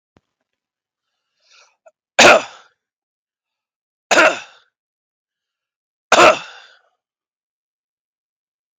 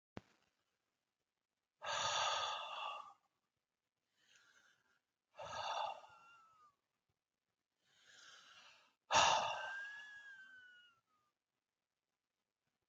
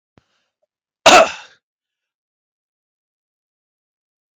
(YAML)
three_cough_length: 8.8 s
three_cough_amplitude: 32768
three_cough_signal_mean_std_ratio: 0.23
exhalation_length: 12.9 s
exhalation_amplitude: 3937
exhalation_signal_mean_std_ratio: 0.34
cough_length: 4.4 s
cough_amplitude: 32768
cough_signal_mean_std_ratio: 0.19
survey_phase: beta (2021-08-13 to 2022-03-07)
age: 45-64
gender: Male
wearing_mask: 'No'
symptom_none: true
smoker_status: Never smoked
respiratory_condition_asthma: false
respiratory_condition_other: false
recruitment_source: REACT
submission_delay: 2 days
covid_test_result: Negative
covid_test_method: RT-qPCR
influenza_a_test_result: Negative
influenza_b_test_result: Negative